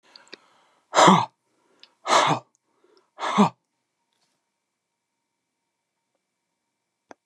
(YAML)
exhalation_length: 7.3 s
exhalation_amplitude: 25543
exhalation_signal_mean_std_ratio: 0.26
survey_phase: beta (2021-08-13 to 2022-03-07)
age: 65+
gender: Male
wearing_mask: 'No'
symptom_none: true
smoker_status: Current smoker (1 to 10 cigarettes per day)
respiratory_condition_asthma: false
respiratory_condition_other: false
recruitment_source: REACT
submission_delay: 2 days
covid_test_result: Negative
covid_test_method: RT-qPCR
influenza_a_test_result: Negative
influenza_b_test_result: Negative